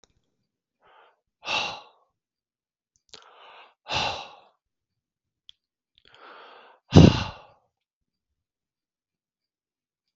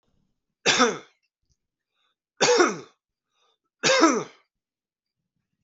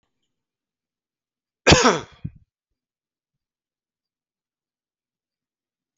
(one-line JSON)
{"exhalation_length": "10.2 s", "exhalation_amplitude": 31390, "exhalation_signal_mean_std_ratio": 0.17, "three_cough_length": "5.6 s", "three_cough_amplitude": 25175, "three_cough_signal_mean_std_ratio": 0.34, "cough_length": "6.0 s", "cough_amplitude": 31942, "cough_signal_mean_std_ratio": 0.17, "survey_phase": "alpha (2021-03-01 to 2021-08-12)", "age": "45-64", "gender": "Male", "wearing_mask": "No", "symptom_none": true, "smoker_status": "Never smoked", "respiratory_condition_asthma": false, "respiratory_condition_other": false, "recruitment_source": "REACT", "submission_delay": "1 day", "covid_test_result": "Negative", "covid_test_method": "RT-qPCR"}